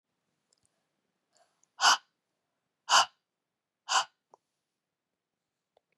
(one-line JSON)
{"exhalation_length": "6.0 s", "exhalation_amplitude": 13755, "exhalation_signal_mean_std_ratio": 0.21, "survey_phase": "beta (2021-08-13 to 2022-03-07)", "age": "45-64", "gender": "Female", "wearing_mask": "No", "symptom_cough_any": true, "symptom_runny_or_blocked_nose": true, "symptom_sore_throat": true, "symptom_headache": true, "symptom_onset": "3 days", "smoker_status": "Ex-smoker", "respiratory_condition_asthma": false, "respiratory_condition_other": false, "recruitment_source": "Test and Trace", "submission_delay": "1 day", "covid_test_result": "Positive", "covid_test_method": "RT-qPCR", "covid_ct_value": 31.1, "covid_ct_gene": "ORF1ab gene"}